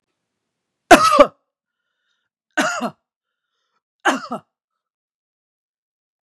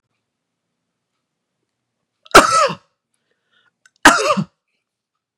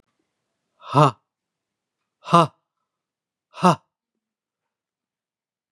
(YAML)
three_cough_length: 6.2 s
three_cough_amplitude: 32768
three_cough_signal_mean_std_ratio: 0.24
cough_length: 5.4 s
cough_amplitude: 32768
cough_signal_mean_std_ratio: 0.26
exhalation_length: 5.7 s
exhalation_amplitude: 31720
exhalation_signal_mean_std_ratio: 0.21
survey_phase: beta (2021-08-13 to 2022-03-07)
age: 45-64
gender: Male
wearing_mask: 'No'
symptom_shortness_of_breath: true
smoker_status: Never smoked
respiratory_condition_asthma: false
respiratory_condition_other: false
recruitment_source: REACT
submission_delay: 21 days
covid_test_result: Negative
covid_test_method: RT-qPCR